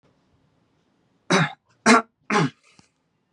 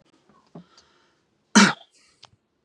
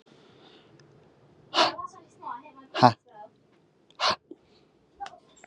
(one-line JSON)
{"three_cough_length": "3.3 s", "three_cough_amplitude": 30655, "three_cough_signal_mean_std_ratio": 0.31, "cough_length": "2.6 s", "cough_amplitude": 29899, "cough_signal_mean_std_ratio": 0.21, "exhalation_length": "5.5 s", "exhalation_amplitude": 26700, "exhalation_signal_mean_std_ratio": 0.25, "survey_phase": "beta (2021-08-13 to 2022-03-07)", "age": "18-44", "gender": "Male", "wearing_mask": "No", "symptom_none": true, "smoker_status": "Never smoked", "respiratory_condition_asthma": false, "respiratory_condition_other": false, "recruitment_source": "REACT", "submission_delay": "0 days", "covid_test_result": "Negative", "covid_test_method": "RT-qPCR", "influenza_a_test_result": "Negative", "influenza_b_test_result": "Negative"}